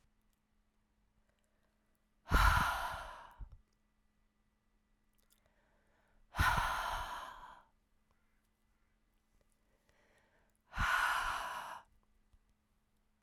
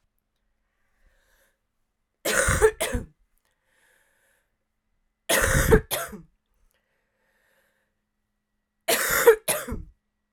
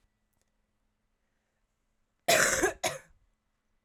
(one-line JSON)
{"exhalation_length": "13.2 s", "exhalation_amplitude": 4995, "exhalation_signal_mean_std_ratio": 0.34, "three_cough_length": "10.3 s", "three_cough_amplitude": 22829, "three_cough_signal_mean_std_ratio": 0.32, "cough_length": "3.8 s", "cough_amplitude": 14529, "cough_signal_mean_std_ratio": 0.29, "survey_phase": "beta (2021-08-13 to 2022-03-07)", "age": "18-44", "gender": "Female", "wearing_mask": "No", "symptom_cough_any": true, "symptom_runny_or_blocked_nose": true, "symptom_shortness_of_breath": true, "symptom_change_to_sense_of_smell_or_taste": true, "smoker_status": "Never smoked", "respiratory_condition_asthma": false, "respiratory_condition_other": false, "recruitment_source": "Test and Trace", "submission_delay": "1 day", "covid_test_result": "Positive", "covid_test_method": "RT-qPCR", "covid_ct_value": 30.5, "covid_ct_gene": "ORF1ab gene", "covid_ct_mean": 31.3, "covid_viral_load": "56 copies/ml", "covid_viral_load_category": "Minimal viral load (< 10K copies/ml)"}